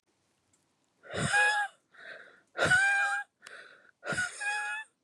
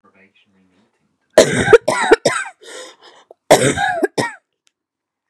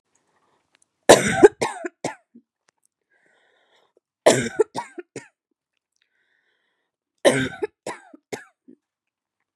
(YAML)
exhalation_length: 5.0 s
exhalation_amplitude: 6098
exhalation_signal_mean_std_ratio: 0.53
cough_length: 5.3 s
cough_amplitude: 32768
cough_signal_mean_std_ratio: 0.37
three_cough_length: 9.6 s
three_cough_amplitude: 32768
three_cough_signal_mean_std_ratio: 0.23
survey_phase: beta (2021-08-13 to 2022-03-07)
age: 18-44
gender: Female
wearing_mask: 'No'
symptom_cough_any: true
symptom_runny_or_blocked_nose: true
smoker_status: Current smoker (1 to 10 cigarettes per day)
respiratory_condition_asthma: true
respiratory_condition_other: false
recruitment_source: REACT
submission_delay: 3 days
covid_test_result: Negative
covid_test_method: RT-qPCR